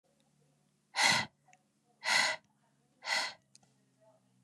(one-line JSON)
{"exhalation_length": "4.4 s", "exhalation_amplitude": 7133, "exhalation_signal_mean_std_ratio": 0.35, "survey_phase": "beta (2021-08-13 to 2022-03-07)", "age": "18-44", "gender": "Female", "wearing_mask": "No", "symptom_none": true, "smoker_status": "Never smoked", "respiratory_condition_asthma": false, "respiratory_condition_other": false, "recruitment_source": "REACT", "submission_delay": "0 days", "covid_test_result": "Negative", "covid_test_method": "RT-qPCR", "influenza_a_test_result": "Negative", "influenza_b_test_result": "Negative"}